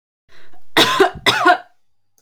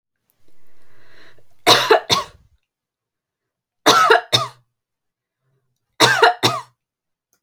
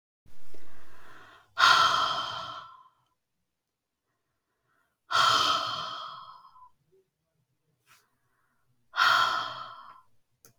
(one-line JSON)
{"cough_length": "2.2 s", "cough_amplitude": 30853, "cough_signal_mean_std_ratio": 0.53, "three_cough_length": "7.4 s", "three_cough_amplitude": 32767, "three_cough_signal_mean_std_ratio": 0.37, "exhalation_length": "10.6 s", "exhalation_amplitude": 17998, "exhalation_signal_mean_std_ratio": 0.46, "survey_phase": "beta (2021-08-13 to 2022-03-07)", "age": "18-44", "gender": "Female", "wearing_mask": "No", "symptom_none": true, "smoker_status": "Never smoked", "respiratory_condition_asthma": false, "respiratory_condition_other": false, "recruitment_source": "REACT", "submission_delay": "0 days", "covid_test_result": "Negative", "covid_test_method": "RT-qPCR"}